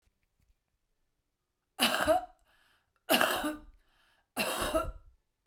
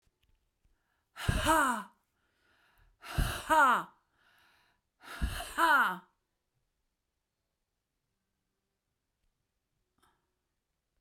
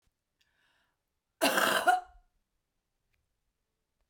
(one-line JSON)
{"three_cough_length": "5.5 s", "three_cough_amplitude": 11640, "three_cough_signal_mean_std_ratio": 0.4, "exhalation_length": "11.0 s", "exhalation_amplitude": 7017, "exhalation_signal_mean_std_ratio": 0.31, "cough_length": "4.1 s", "cough_amplitude": 9329, "cough_signal_mean_std_ratio": 0.29, "survey_phase": "beta (2021-08-13 to 2022-03-07)", "age": "45-64", "gender": "Female", "wearing_mask": "No", "symptom_none": true, "symptom_onset": "12 days", "smoker_status": "Never smoked", "respiratory_condition_asthma": true, "respiratory_condition_other": false, "recruitment_source": "REACT", "submission_delay": "1 day", "covid_test_result": "Negative", "covid_test_method": "RT-qPCR"}